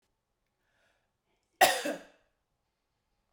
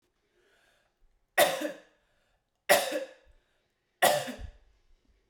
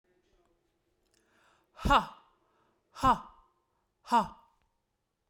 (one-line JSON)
{"cough_length": "3.3 s", "cough_amplitude": 12267, "cough_signal_mean_std_ratio": 0.2, "three_cough_length": "5.3 s", "three_cough_amplitude": 14665, "three_cough_signal_mean_std_ratio": 0.31, "exhalation_length": "5.3 s", "exhalation_amplitude": 8474, "exhalation_signal_mean_std_ratio": 0.25, "survey_phase": "beta (2021-08-13 to 2022-03-07)", "age": "18-44", "gender": "Female", "wearing_mask": "No", "symptom_none": true, "smoker_status": "Ex-smoker", "respiratory_condition_asthma": false, "respiratory_condition_other": false, "recruitment_source": "REACT", "submission_delay": "3 days", "covid_test_result": "Negative", "covid_test_method": "RT-qPCR", "influenza_a_test_result": "Negative", "influenza_b_test_result": "Negative"}